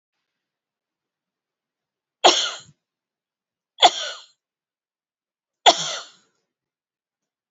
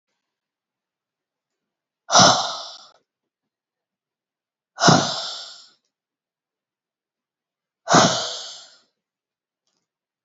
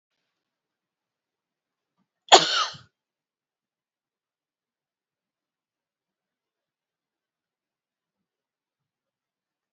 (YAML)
three_cough_length: 7.5 s
three_cough_amplitude: 31915
three_cough_signal_mean_std_ratio: 0.2
exhalation_length: 10.2 s
exhalation_amplitude: 31535
exhalation_signal_mean_std_ratio: 0.26
cough_length: 9.7 s
cough_amplitude: 29062
cough_signal_mean_std_ratio: 0.11
survey_phase: alpha (2021-03-01 to 2021-08-12)
age: 45-64
gender: Female
wearing_mask: 'No'
symptom_none: true
smoker_status: Ex-smoker
respiratory_condition_asthma: false
respiratory_condition_other: false
recruitment_source: REACT
submission_delay: 5 days
covid_test_result: Negative
covid_test_method: RT-qPCR